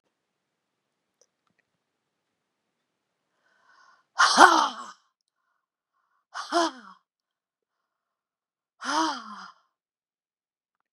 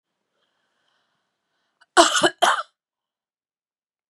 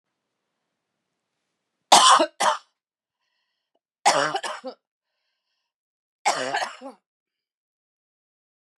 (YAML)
exhalation_length: 10.9 s
exhalation_amplitude: 32768
exhalation_signal_mean_std_ratio: 0.22
cough_length: 4.1 s
cough_amplitude: 32767
cough_signal_mean_std_ratio: 0.25
three_cough_length: 8.8 s
three_cough_amplitude: 30596
three_cough_signal_mean_std_ratio: 0.27
survey_phase: beta (2021-08-13 to 2022-03-07)
age: 45-64
gender: Female
wearing_mask: 'Yes'
symptom_cough_any: true
symptom_other: true
symptom_onset: 12 days
smoker_status: Never smoked
respiratory_condition_asthma: false
respiratory_condition_other: false
recruitment_source: REACT
submission_delay: 2 days
covid_test_result: Negative
covid_test_method: RT-qPCR
influenza_a_test_result: Negative
influenza_b_test_result: Negative